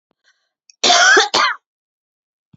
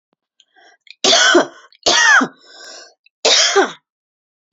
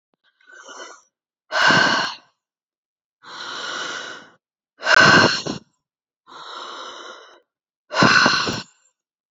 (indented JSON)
{
  "cough_length": "2.6 s",
  "cough_amplitude": 32768,
  "cough_signal_mean_std_ratio": 0.42,
  "three_cough_length": "4.5 s",
  "three_cough_amplitude": 30939,
  "three_cough_signal_mean_std_ratio": 0.47,
  "exhalation_length": "9.3 s",
  "exhalation_amplitude": 28546,
  "exhalation_signal_mean_std_ratio": 0.4,
  "survey_phase": "beta (2021-08-13 to 2022-03-07)",
  "age": "45-64",
  "gender": "Female",
  "wearing_mask": "No",
  "symptom_headache": true,
  "symptom_onset": "12 days",
  "smoker_status": "Ex-smoker",
  "respiratory_condition_asthma": false,
  "respiratory_condition_other": false,
  "recruitment_source": "REACT",
  "submission_delay": "2 days",
  "covid_test_result": "Negative",
  "covid_test_method": "RT-qPCR",
  "influenza_a_test_result": "Negative",
  "influenza_b_test_result": "Negative"
}